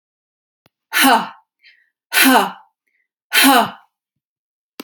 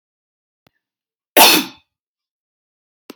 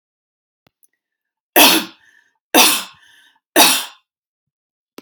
{
  "exhalation_length": "4.8 s",
  "exhalation_amplitude": 32768,
  "exhalation_signal_mean_std_ratio": 0.38,
  "cough_length": "3.2 s",
  "cough_amplitude": 32768,
  "cough_signal_mean_std_ratio": 0.23,
  "three_cough_length": "5.0 s",
  "three_cough_amplitude": 32768,
  "three_cough_signal_mean_std_ratio": 0.32,
  "survey_phase": "alpha (2021-03-01 to 2021-08-12)",
  "age": "45-64",
  "gender": "Female",
  "wearing_mask": "No",
  "symptom_none": true,
  "smoker_status": "Ex-smoker",
  "respiratory_condition_asthma": false,
  "respiratory_condition_other": false,
  "recruitment_source": "REACT",
  "submission_delay": "2 days",
  "covid_test_result": "Negative",
  "covid_test_method": "RT-qPCR"
}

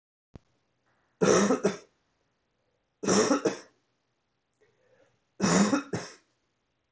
{
  "three_cough_length": "6.9 s",
  "three_cough_amplitude": 10557,
  "three_cough_signal_mean_std_ratio": 0.37,
  "survey_phase": "beta (2021-08-13 to 2022-03-07)",
  "age": "45-64",
  "gender": "Male",
  "wearing_mask": "No",
  "symptom_cough_any": true,
  "symptom_runny_or_blocked_nose": true,
  "symptom_sore_throat": true,
  "symptom_diarrhoea": true,
  "symptom_fatigue": true,
  "symptom_headache": true,
  "symptom_onset": "4 days",
  "smoker_status": "Ex-smoker",
  "respiratory_condition_asthma": false,
  "respiratory_condition_other": false,
  "recruitment_source": "Test and Trace",
  "submission_delay": "1 day",
  "covid_test_result": "Positive",
  "covid_test_method": "RT-qPCR",
  "covid_ct_value": 12.6,
  "covid_ct_gene": "ORF1ab gene"
}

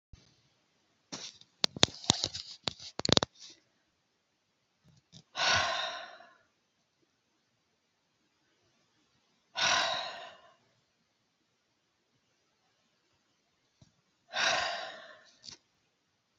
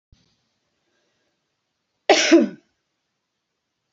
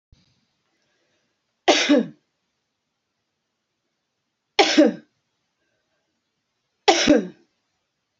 {
  "exhalation_length": "16.4 s",
  "exhalation_amplitude": 29671,
  "exhalation_signal_mean_std_ratio": 0.26,
  "cough_length": "3.9 s",
  "cough_amplitude": 28087,
  "cough_signal_mean_std_ratio": 0.24,
  "three_cough_length": "8.2 s",
  "three_cough_amplitude": 28343,
  "three_cough_signal_mean_std_ratio": 0.27,
  "survey_phase": "beta (2021-08-13 to 2022-03-07)",
  "age": "45-64",
  "gender": "Female",
  "wearing_mask": "No",
  "symptom_none": true,
  "smoker_status": "Ex-smoker",
  "respiratory_condition_asthma": false,
  "respiratory_condition_other": false,
  "recruitment_source": "REACT",
  "submission_delay": "2 days",
  "covid_test_result": "Negative",
  "covid_test_method": "RT-qPCR"
}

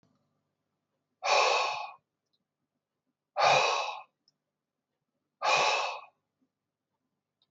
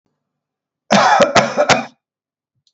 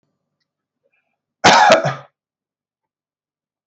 {
  "exhalation_length": "7.5 s",
  "exhalation_amplitude": 8393,
  "exhalation_signal_mean_std_ratio": 0.38,
  "three_cough_length": "2.7 s",
  "three_cough_amplitude": 32768,
  "three_cough_signal_mean_std_ratio": 0.45,
  "cough_length": "3.7 s",
  "cough_amplitude": 32768,
  "cough_signal_mean_std_ratio": 0.29,
  "survey_phase": "beta (2021-08-13 to 2022-03-07)",
  "age": "45-64",
  "gender": "Male",
  "wearing_mask": "No",
  "symptom_none": true,
  "smoker_status": "Never smoked",
  "respiratory_condition_asthma": false,
  "respiratory_condition_other": false,
  "recruitment_source": "REACT",
  "submission_delay": "1 day",
  "covid_test_result": "Negative",
  "covid_test_method": "RT-qPCR"
}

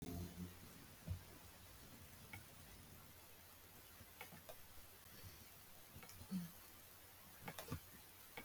{
  "exhalation_length": "8.4 s",
  "exhalation_amplitude": 807,
  "exhalation_signal_mean_std_ratio": 0.78,
  "survey_phase": "beta (2021-08-13 to 2022-03-07)",
  "age": "65+",
  "gender": "Female",
  "wearing_mask": "No",
  "symptom_none": true,
  "smoker_status": "Never smoked",
  "respiratory_condition_asthma": false,
  "respiratory_condition_other": false,
  "recruitment_source": "REACT",
  "submission_delay": "3 days",
  "covid_test_result": "Negative",
  "covid_test_method": "RT-qPCR",
  "influenza_a_test_result": "Negative",
  "influenza_b_test_result": "Negative"
}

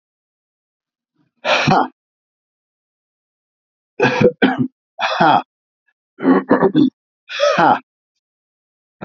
{
  "exhalation_length": "9.0 s",
  "exhalation_amplitude": 31945,
  "exhalation_signal_mean_std_ratio": 0.41,
  "survey_phase": "beta (2021-08-13 to 2022-03-07)",
  "age": "65+",
  "gender": "Male",
  "wearing_mask": "No",
  "symptom_cough_any": true,
  "symptom_fatigue": true,
  "symptom_fever_high_temperature": true,
  "symptom_headache": true,
  "symptom_other": true,
  "smoker_status": "Ex-smoker",
  "respiratory_condition_asthma": false,
  "respiratory_condition_other": false,
  "recruitment_source": "Test and Trace",
  "submission_delay": "2 days",
  "covid_test_result": "Positive",
  "covid_test_method": "RT-qPCR",
  "covid_ct_value": 22.8,
  "covid_ct_gene": "ORF1ab gene",
  "covid_ct_mean": 23.6,
  "covid_viral_load": "18000 copies/ml",
  "covid_viral_load_category": "Low viral load (10K-1M copies/ml)"
}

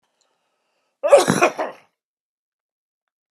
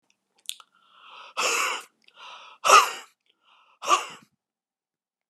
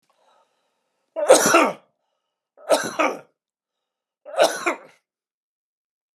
{
  "cough_length": "3.3 s",
  "cough_amplitude": 32606,
  "cough_signal_mean_std_ratio": 0.28,
  "exhalation_length": "5.3 s",
  "exhalation_amplitude": 26299,
  "exhalation_signal_mean_std_ratio": 0.29,
  "three_cough_length": "6.1 s",
  "three_cough_amplitude": 32703,
  "three_cough_signal_mean_std_ratio": 0.32,
  "survey_phase": "alpha (2021-03-01 to 2021-08-12)",
  "age": "45-64",
  "gender": "Male",
  "wearing_mask": "No",
  "symptom_none": true,
  "smoker_status": "Never smoked",
  "respiratory_condition_asthma": false,
  "respiratory_condition_other": false,
  "recruitment_source": "REACT",
  "submission_delay": "2 days",
  "covid_test_result": "Negative",
  "covid_test_method": "RT-qPCR"
}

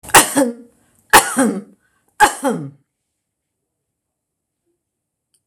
{
  "three_cough_length": "5.5 s",
  "three_cough_amplitude": 26028,
  "three_cough_signal_mean_std_ratio": 0.31,
  "survey_phase": "beta (2021-08-13 to 2022-03-07)",
  "age": "65+",
  "gender": "Female",
  "wearing_mask": "No",
  "symptom_none": true,
  "smoker_status": "Ex-smoker",
  "respiratory_condition_asthma": false,
  "respiratory_condition_other": false,
  "recruitment_source": "REACT",
  "submission_delay": "2 days",
  "covid_test_result": "Negative",
  "covid_test_method": "RT-qPCR"
}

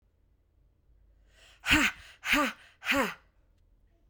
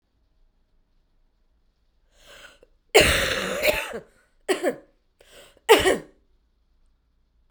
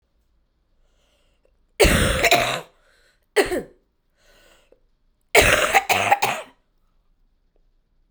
{
  "exhalation_length": "4.1 s",
  "exhalation_amplitude": 11702,
  "exhalation_signal_mean_std_ratio": 0.36,
  "cough_length": "7.5 s",
  "cough_amplitude": 31601,
  "cough_signal_mean_std_ratio": 0.31,
  "three_cough_length": "8.1 s",
  "three_cough_amplitude": 32767,
  "three_cough_signal_mean_std_ratio": 0.37,
  "survey_phase": "beta (2021-08-13 to 2022-03-07)",
  "age": "18-44",
  "gender": "Female",
  "wearing_mask": "No",
  "symptom_cough_any": true,
  "symptom_shortness_of_breath": true,
  "symptom_onset": "6 days",
  "smoker_status": "Never smoked",
  "respiratory_condition_asthma": false,
  "respiratory_condition_other": false,
  "recruitment_source": "Test and Trace",
  "submission_delay": "2 days",
  "covid_test_method": "RT-qPCR",
  "covid_ct_value": 26.6,
  "covid_ct_gene": "N gene"
}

